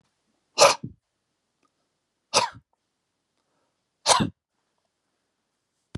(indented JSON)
{
  "exhalation_length": "6.0 s",
  "exhalation_amplitude": 31739,
  "exhalation_signal_mean_std_ratio": 0.22,
  "survey_phase": "alpha (2021-03-01 to 2021-08-12)",
  "age": "65+",
  "gender": "Male",
  "wearing_mask": "No",
  "symptom_none": true,
  "smoker_status": "Never smoked",
  "respiratory_condition_asthma": false,
  "respiratory_condition_other": false,
  "recruitment_source": "REACT",
  "submission_delay": "2 days",
  "covid_test_result": "Negative",
  "covid_test_method": "RT-qPCR"
}